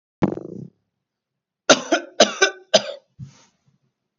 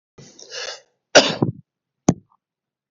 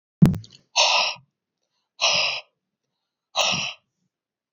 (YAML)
three_cough_length: 4.2 s
three_cough_amplitude: 31878
three_cough_signal_mean_std_ratio: 0.29
cough_length: 2.9 s
cough_amplitude: 31416
cough_signal_mean_std_ratio: 0.26
exhalation_length: 4.5 s
exhalation_amplitude: 26148
exhalation_signal_mean_std_ratio: 0.39
survey_phase: beta (2021-08-13 to 2022-03-07)
age: 18-44
gender: Male
wearing_mask: 'No'
symptom_none: true
smoker_status: Never smoked
respiratory_condition_asthma: false
respiratory_condition_other: false
recruitment_source: REACT
submission_delay: 0 days
covid_test_result: Negative
covid_test_method: RT-qPCR
influenza_a_test_result: Negative
influenza_b_test_result: Negative